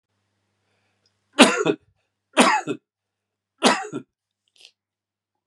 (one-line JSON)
{"three_cough_length": "5.5 s", "three_cough_amplitude": 32768, "three_cough_signal_mean_std_ratio": 0.28, "survey_phase": "beta (2021-08-13 to 2022-03-07)", "age": "45-64", "gender": "Male", "wearing_mask": "No", "symptom_cough_any": true, "symptom_new_continuous_cough": true, "symptom_runny_or_blocked_nose": true, "symptom_shortness_of_breath": true, "symptom_sore_throat": true, "symptom_abdominal_pain": true, "symptom_fatigue": true, "symptom_onset": "2 days", "smoker_status": "Ex-smoker", "respiratory_condition_asthma": false, "respiratory_condition_other": false, "recruitment_source": "Test and Trace", "submission_delay": "2 days", "covid_test_result": "Positive", "covid_test_method": "RT-qPCR", "covid_ct_value": 20.1, "covid_ct_gene": "ORF1ab gene", "covid_ct_mean": 20.2, "covid_viral_load": "240000 copies/ml", "covid_viral_load_category": "Low viral load (10K-1M copies/ml)"}